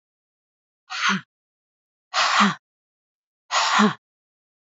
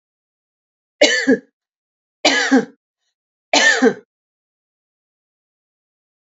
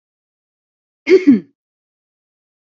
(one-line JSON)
{"exhalation_length": "4.6 s", "exhalation_amplitude": 21103, "exhalation_signal_mean_std_ratio": 0.39, "three_cough_length": "6.3 s", "three_cough_amplitude": 32768, "three_cough_signal_mean_std_ratio": 0.33, "cough_length": "2.6 s", "cough_amplitude": 32768, "cough_signal_mean_std_ratio": 0.25, "survey_phase": "beta (2021-08-13 to 2022-03-07)", "age": "18-44", "gender": "Female", "wearing_mask": "No", "symptom_none": true, "smoker_status": "Never smoked", "respiratory_condition_asthma": false, "respiratory_condition_other": false, "recruitment_source": "REACT", "submission_delay": "5 days", "covid_test_result": "Negative", "covid_test_method": "RT-qPCR"}